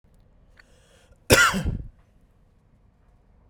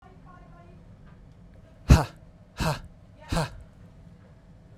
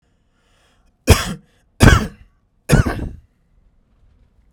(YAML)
cough_length: 3.5 s
cough_amplitude: 30066
cough_signal_mean_std_ratio: 0.28
exhalation_length: 4.8 s
exhalation_amplitude: 25744
exhalation_signal_mean_std_ratio: 0.27
three_cough_length: 4.5 s
three_cough_amplitude: 32768
three_cough_signal_mean_std_ratio: 0.29
survey_phase: beta (2021-08-13 to 2022-03-07)
age: 18-44
gender: Male
wearing_mask: 'No'
symptom_fatigue: true
smoker_status: Ex-smoker
respiratory_condition_asthma: true
respiratory_condition_other: false
recruitment_source: REACT
submission_delay: 2 days
covid_test_result: Negative
covid_test_method: RT-qPCR
influenza_a_test_result: Negative
influenza_b_test_result: Negative